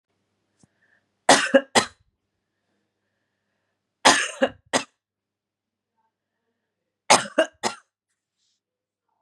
three_cough_length: 9.2 s
three_cough_amplitude: 32766
three_cough_signal_mean_std_ratio: 0.23
survey_phase: beta (2021-08-13 to 2022-03-07)
age: 45-64
gender: Female
wearing_mask: 'No'
symptom_none: true
smoker_status: Ex-smoker
respiratory_condition_asthma: false
respiratory_condition_other: false
recruitment_source: REACT
submission_delay: 2 days
covid_test_result: Negative
covid_test_method: RT-qPCR
influenza_a_test_result: Negative
influenza_b_test_result: Negative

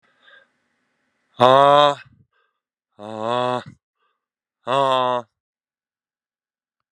exhalation_length: 6.9 s
exhalation_amplitude: 32767
exhalation_signal_mean_std_ratio: 0.3
survey_phase: beta (2021-08-13 to 2022-03-07)
age: 45-64
gender: Male
wearing_mask: 'No'
symptom_runny_or_blocked_nose: true
symptom_sore_throat: true
symptom_fatigue: true
symptom_headache: true
symptom_onset: 4 days
smoker_status: Ex-smoker
respiratory_condition_asthma: false
respiratory_condition_other: false
recruitment_source: Test and Trace
submission_delay: 1 day
covid_test_result: Positive
covid_test_method: ePCR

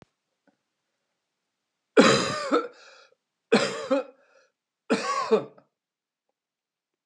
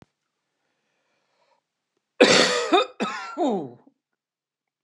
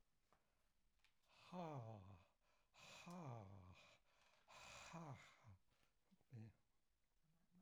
three_cough_length: 7.1 s
three_cough_amplitude: 20980
three_cough_signal_mean_std_ratio: 0.34
cough_length: 4.8 s
cough_amplitude: 28408
cough_signal_mean_std_ratio: 0.35
exhalation_length: 7.6 s
exhalation_amplitude: 256
exhalation_signal_mean_std_ratio: 0.57
survey_phase: alpha (2021-03-01 to 2021-08-12)
age: 65+
gender: Male
wearing_mask: 'No'
symptom_none: true
symptom_onset: 13 days
smoker_status: Ex-smoker
respiratory_condition_asthma: false
respiratory_condition_other: false
recruitment_source: REACT
submission_delay: 2 days
covid_test_result: Negative
covid_test_method: RT-qPCR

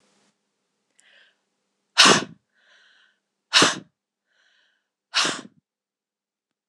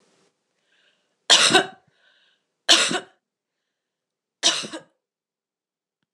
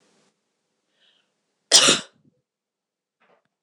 exhalation_length: 6.7 s
exhalation_amplitude: 26028
exhalation_signal_mean_std_ratio: 0.23
three_cough_length: 6.1 s
three_cough_amplitude: 26028
three_cough_signal_mean_std_ratio: 0.27
cough_length: 3.6 s
cough_amplitude: 26028
cough_signal_mean_std_ratio: 0.21
survey_phase: beta (2021-08-13 to 2022-03-07)
age: 18-44
gender: Female
wearing_mask: 'No'
symptom_cough_any: true
symptom_runny_or_blocked_nose: true
symptom_other: true
symptom_onset: 5 days
smoker_status: Never smoked
respiratory_condition_asthma: false
respiratory_condition_other: false
recruitment_source: Test and Trace
submission_delay: 3 days
covid_test_result: Positive
covid_test_method: RT-qPCR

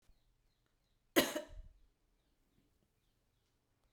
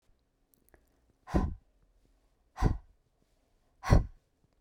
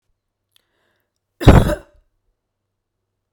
cough_length: 3.9 s
cough_amplitude: 6652
cough_signal_mean_std_ratio: 0.19
exhalation_length: 4.6 s
exhalation_amplitude: 10687
exhalation_signal_mean_std_ratio: 0.25
three_cough_length: 3.3 s
three_cough_amplitude: 32768
three_cough_signal_mean_std_ratio: 0.22
survey_phase: beta (2021-08-13 to 2022-03-07)
age: 45-64
gender: Female
wearing_mask: 'No'
symptom_none: true
smoker_status: Never smoked
respiratory_condition_asthma: false
respiratory_condition_other: false
recruitment_source: REACT
submission_delay: 6 days
covid_test_result: Negative
covid_test_method: RT-qPCR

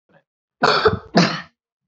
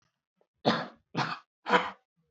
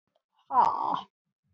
cough_length: 1.9 s
cough_amplitude: 28429
cough_signal_mean_std_ratio: 0.43
three_cough_length: 2.3 s
three_cough_amplitude: 13590
three_cough_signal_mean_std_ratio: 0.37
exhalation_length: 1.5 s
exhalation_amplitude: 8752
exhalation_signal_mean_std_ratio: 0.42
survey_phase: beta (2021-08-13 to 2022-03-07)
age: 45-64
gender: Male
wearing_mask: 'No'
symptom_runny_or_blocked_nose: true
symptom_headache: true
symptom_onset: 3 days
smoker_status: Never smoked
respiratory_condition_asthma: false
respiratory_condition_other: false
recruitment_source: Test and Trace
submission_delay: 2 days
covid_test_result: Positive
covid_test_method: RT-qPCR
covid_ct_value: 22.0
covid_ct_gene: ORF1ab gene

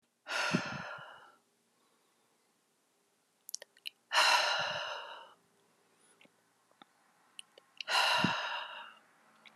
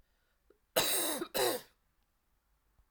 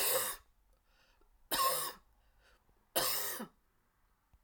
exhalation_length: 9.6 s
exhalation_amplitude: 6019
exhalation_signal_mean_std_ratio: 0.39
cough_length: 2.9 s
cough_amplitude: 6582
cough_signal_mean_std_ratio: 0.42
three_cough_length: 4.4 s
three_cough_amplitude: 4047
three_cough_signal_mean_std_ratio: 0.45
survey_phase: alpha (2021-03-01 to 2021-08-12)
age: 45-64
gender: Female
wearing_mask: 'No'
symptom_cough_any: true
symptom_fatigue: true
smoker_status: Never smoked
respiratory_condition_asthma: false
respiratory_condition_other: false
recruitment_source: Test and Trace
submission_delay: 1 day
covid_test_result: Positive
covid_test_method: RT-qPCR
covid_ct_value: 16.9
covid_ct_gene: N gene
covid_ct_mean: 17.9
covid_viral_load: 1300000 copies/ml
covid_viral_load_category: High viral load (>1M copies/ml)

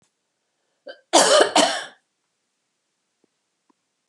cough_length: 4.1 s
cough_amplitude: 29540
cough_signal_mean_std_ratio: 0.3
survey_phase: beta (2021-08-13 to 2022-03-07)
age: 65+
gender: Female
wearing_mask: 'No'
symptom_none: true
smoker_status: Never smoked
respiratory_condition_asthma: false
respiratory_condition_other: false
recruitment_source: REACT
submission_delay: 0 days
covid_test_result: Negative
covid_test_method: RT-qPCR
covid_ct_value: 39.0
covid_ct_gene: N gene
influenza_a_test_result: Negative
influenza_b_test_result: Negative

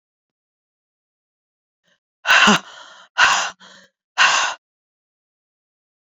exhalation_length: 6.1 s
exhalation_amplitude: 32364
exhalation_signal_mean_std_ratio: 0.32
survey_phase: beta (2021-08-13 to 2022-03-07)
age: 18-44
gender: Female
wearing_mask: 'No'
symptom_cough_any: true
symptom_runny_or_blocked_nose: true
symptom_shortness_of_breath: true
symptom_sore_throat: true
symptom_abdominal_pain: true
symptom_diarrhoea: true
symptom_fatigue: true
symptom_fever_high_temperature: true
symptom_headache: true
symptom_change_to_sense_of_smell_or_taste: true
symptom_loss_of_taste: true
smoker_status: Ex-smoker
respiratory_condition_asthma: false
respiratory_condition_other: false
recruitment_source: Test and Trace
submission_delay: 2 days
covid_test_result: Positive
covid_test_method: RT-qPCR
covid_ct_value: 27.6
covid_ct_gene: ORF1ab gene
covid_ct_mean: 28.3
covid_viral_load: 510 copies/ml
covid_viral_load_category: Minimal viral load (< 10K copies/ml)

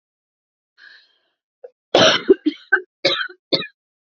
cough_length: 4.0 s
cough_amplitude: 32767
cough_signal_mean_std_ratio: 0.32
survey_phase: alpha (2021-03-01 to 2021-08-12)
age: 18-44
gender: Female
wearing_mask: 'No'
symptom_none: true
symptom_onset: 5 days
smoker_status: Ex-smoker
respiratory_condition_asthma: false
respiratory_condition_other: false
recruitment_source: REACT
submission_delay: 1 day
covid_test_result: Negative
covid_test_method: RT-qPCR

